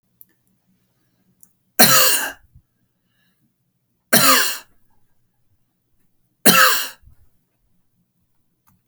{"three_cough_length": "8.9 s", "three_cough_amplitude": 32768, "three_cough_signal_mean_std_ratio": 0.3, "survey_phase": "alpha (2021-03-01 to 2021-08-12)", "age": "45-64", "gender": "Male", "wearing_mask": "No", "symptom_none": true, "smoker_status": "Never smoked", "respiratory_condition_asthma": false, "respiratory_condition_other": false, "recruitment_source": "REACT", "submission_delay": "3 days", "covid_test_result": "Negative", "covid_test_method": "RT-qPCR"}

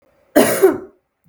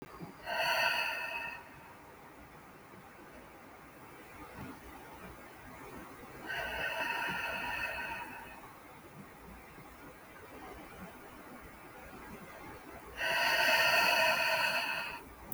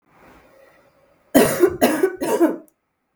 {"cough_length": "1.3 s", "cough_amplitude": 32766, "cough_signal_mean_std_ratio": 0.44, "exhalation_length": "15.5 s", "exhalation_amplitude": 5074, "exhalation_signal_mean_std_ratio": 0.6, "three_cough_length": "3.2 s", "three_cough_amplitude": 32766, "three_cough_signal_mean_std_ratio": 0.45, "survey_phase": "beta (2021-08-13 to 2022-03-07)", "age": "18-44", "gender": "Female", "wearing_mask": "No", "symptom_cough_any": true, "symptom_runny_or_blocked_nose": true, "symptom_onset": "8 days", "smoker_status": "Never smoked", "respiratory_condition_asthma": false, "respiratory_condition_other": false, "recruitment_source": "REACT", "submission_delay": "2 days", "covid_test_result": "Negative", "covid_test_method": "RT-qPCR", "influenza_a_test_result": "Unknown/Void", "influenza_b_test_result": "Unknown/Void"}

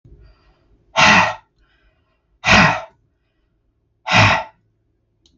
{"exhalation_length": "5.4 s", "exhalation_amplitude": 32768, "exhalation_signal_mean_std_ratio": 0.36, "survey_phase": "beta (2021-08-13 to 2022-03-07)", "age": "65+", "gender": "Male", "wearing_mask": "No", "symptom_none": true, "smoker_status": "Ex-smoker", "respiratory_condition_asthma": false, "respiratory_condition_other": false, "recruitment_source": "REACT", "submission_delay": "8 days", "covid_test_result": "Negative", "covid_test_method": "RT-qPCR"}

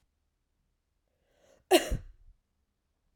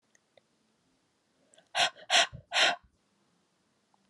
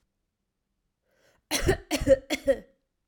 {"cough_length": "3.2 s", "cough_amplitude": 15341, "cough_signal_mean_std_ratio": 0.19, "exhalation_length": "4.1 s", "exhalation_amplitude": 9839, "exhalation_signal_mean_std_ratio": 0.29, "three_cough_length": "3.1 s", "three_cough_amplitude": 12962, "three_cough_signal_mean_std_ratio": 0.34, "survey_phase": "alpha (2021-03-01 to 2021-08-12)", "age": "18-44", "gender": "Female", "wearing_mask": "No", "symptom_fatigue": true, "symptom_fever_high_temperature": true, "symptom_change_to_sense_of_smell_or_taste": true, "symptom_loss_of_taste": true, "smoker_status": "Never smoked", "respiratory_condition_asthma": false, "respiratory_condition_other": false, "recruitment_source": "Test and Trace", "submission_delay": "2 days", "covid_test_result": "Positive", "covid_test_method": "LFT"}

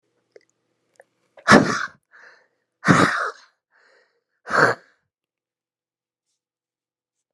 {"exhalation_length": "7.3 s", "exhalation_amplitude": 32768, "exhalation_signal_mean_std_ratio": 0.26, "survey_phase": "beta (2021-08-13 to 2022-03-07)", "age": "45-64", "gender": "Female", "wearing_mask": "No", "symptom_cough_any": true, "symptom_runny_or_blocked_nose": true, "symptom_change_to_sense_of_smell_or_taste": true, "smoker_status": "Never smoked", "respiratory_condition_asthma": false, "respiratory_condition_other": false, "recruitment_source": "Test and Trace", "submission_delay": "6 days", "covid_test_method": "PCR"}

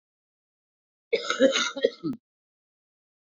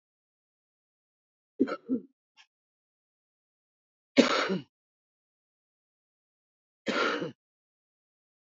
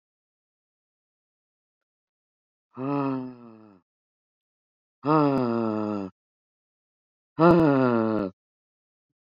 {"cough_length": "3.2 s", "cough_amplitude": 14063, "cough_signal_mean_std_ratio": 0.34, "three_cough_length": "8.5 s", "three_cough_amplitude": 17147, "three_cough_signal_mean_std_ratio": 0.25, "exhalation_length": "9.3 s", "exhalation_amplitude": 17692, "exhalation_signal_mean_std_ratio": 0.36, "survey_phase": "beta (2021-08-13 to 2022-03-07)", "age": "65+", "gender": "Female", "wearing_mask": "No", "symptom_cough_any": true, "smoker_status": "Current smoker (1 to 10 cigarettes per day)", "respiratory_condition_asthma": false, "respiratory_condition_other": false, "recruitment_source": "REACT", "submission_delay": "4 days", "covid_test_result": "Negative", "covid_test_method": "RT-qPCR", "influenza_a_test_result": "Negative", "influenza_b_test_result": "Negative"}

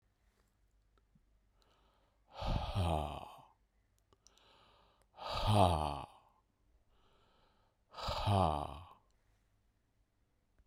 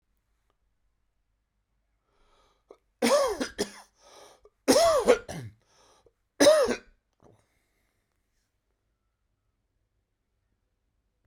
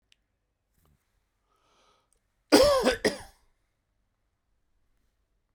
{"exhalation_length": "10.7 s", "exhalation_amplitude": 5889, "exhalation_signal_mean_std_ratio": 0.36, "three_cough_length": "11.3 s", "three_cough_amplitude": 17896, "three_cough_signal_mean_std_ratio": 0.28, "cough_length": "5.5 s", "cough_amplitude": 17179, "cough_signal_mean_std_ratio": 0.24, "survey_phase": "beta (2021-08-13 to 2022-03-07)", "age": "45-64", "gender": "Male", "wearing_mask": "No", "symptom_none": true, "smoker_status": "Ex-smoker", "respiratory_condition_asthma": false, "respiratory_condition_other": false, "recruitment_source": "REACT", "submission_delay": "4 days", "covid_test_result": "Negative", "covid_test_method": "RT-qPCR"}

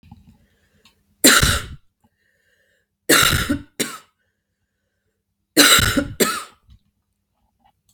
{"three_cough_length": "7.9 s", "three_cough_amplitude": 32768, "three_cough_signal_mean_std_ratio": 0.34, "survey_phase": "beta (2021-08-13 to 2022-03-07)", "age": "18-44", "gender": "Female", "wearing_mask": "No", "symptom_cough_any": true, "symptom_runny_or_blocked_nose": true, "symptom_loss_of_taste": true, "symptom_onset": "3 days", "smoker_status": "Never smoked", "respiratory_condition_asthma": false, "respiratory_condition_other": false, "recruitment_source": "Test and Trace", "submission_delay": "1 day", "covid_test_result": "Positive", "covid_test_method": "RT-qPCR", "covid_ct_value": 15.4, "covid_ct_gene": "ORF1ab gene", "covid_ct_mean": 15.7, "covid_viral_load": "7000000 copies/ml", "covid_viral_load_category": "High viral load (>1M copies/ml)"}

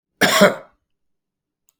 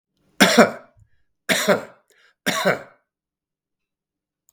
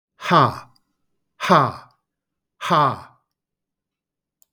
{"cough_length": "1.8 s", "cough_amplitude": 32768, "cough_signal_mean_std_ratio": 0.33, "three_cough_length": "4.5 s", "three_cough_amplitude": 32766, "three_cough_signal_mean_std_ratio": 0.32, "exhalation_length": "4.5 s", "exhalation_amplitude": 32270, "exhalation_signal_mean_std_ratio": 0.34, "survey_phase": "beta (2021-08-13 to 2022-03-07)", "age": "45-64", "gender": "Male", "wearing_mask": "No", "symptom_none": true, "smoker_status": "Never smoked", "respiratory_condition_asthma": false, "respiratory_condition_other": false, "recruitment_source": "REACT", "submission_delay": "3 days", "covid_test_result": "Negative", "covid_test_method": "RT-qPCR", "influenza_a_test_result": "Negative", "influenza_b_test_result": "Negative"}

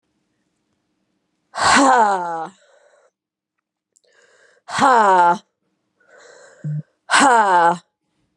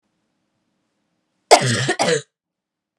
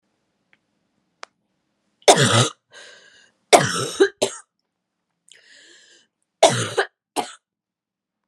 {"exhalation_length": "8.4 s", "exhalation_amplitude": 31948, "exhalation_signal_mean_std_ratio": 0.44, "cough_length": "3.0 s", "cough_amplitude": 32768, "cough_signal_mean_std_ratio": 0.32, "three_cough_length": "8.3 s", "three_cough_amplitude": 32768, "three_cough_signal_mean_std_ratio": 0.28, "survey_phase": "beta (2021-08-13 to 2022-03-07)", "age": "18-44", "gender": "Female", "wearing_mask": "No", "symptom_new_continuous_cough": true, "symptom_runny_or_blocked_nose": true, "symptom_diarrhoea": true, "symptom_fatigue": true, "symptom_headache": true, "symptom_onset": "5 days", "smoker_status": "Current smoker (1 to 10 cigarettes per day)", "respiratory_condition_asthma": true, "respiratory_condition_other": false, "recruitment_source": "Test and Trace", "submission_delay": "1 day", "covid_test_result": "Positive", "covid_test_method": "RT-qPCR", "covid_ct_value": 18.2, "covid_ct_gene": "N gene"}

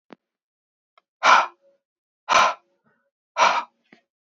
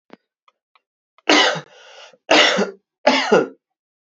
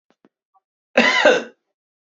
{"exhalation_length": "4.4 s", "exhalation_amplitude": 27753, "exhalation_signal_mean_std_ratio": 0.31, "three_cough_length": "4.2 s", "three_cough_amplitude": 32767, "three_cough_signal_mean_std_ratio": 0.4, "cough_length": "2.0 s", "cough_amplitude": 27843, "cough_signal_mean_std_ratio": 0.37, "survey_phase": "beta (2021-08-13 to 2022-03-07)", "age": "18-44", "gender": "Male", "wearing_mask": "No", "symptom_cough_any": true, "symptom_new_continuous_cough": true, "symptom_runny_or_blocked_nose": true, "symptom_shortness_of_breath": true, "symptom_sore_throat": true, "symptom_fatigue": true, "symptom_headache": true, "symptom_change_to_sense_of_smell_or_taste": true, "symptom_loss_of_taste": true, "symptom_other": true, "symptom_onset": "3 days", "smoker_status": "Ex-smoker", "respiratory_condition_asthma": false, "respiratory_condition_other": false, "recruitment_source": "Test and Trace", "submission_delay": "1 day", "covid_test_result": "Positive", "covid_test_method": "RT-qPCR", "covid_ct_value": 23.0, "covid_ct_gene": "ORF1ab gene", "covid_ct_mean": 24.2, "covid_viral_load": "11000 copies/ml", "covid_viral_load_category": "Low viral load (10K-1M copies/ml)"}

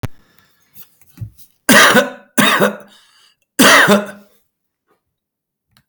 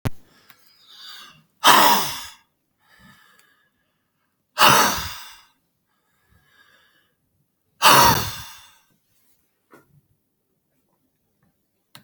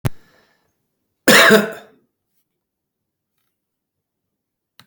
{"three_cough_length": "5.9 s", "three_cough_amplitude": 32768, "three_cough_signal_mean_std_ratio": 0.39, "exhalation_length": "12.0 s", "exhalation_amplitude": 32768, "exhalation_signal_mean_std_ratio": 0.28, "cough_length": "4.9 s", "cough_amplitude": 32768, "cough_signal_mean_std_ratio": 0.25, "survey_phase": "beta (2021-08-13 to 2022-03-07)", "age": "45-64", "gender": "Male", "wearing_mask": "No", "symptom_none": true, "smoker_status": "Current smoker (11 or more cigarettes per day)", "respiratory_condition_asthma": false, "respiratory_condition_other": true, "recruitment_source": "REACT", "submission_delay": "3 days", "covid_test_result": "Negative", "covid_test_method": "RT-qPCR", "influenza_a_test_result": "Negative", "influenza_b_test_result": "Negative"}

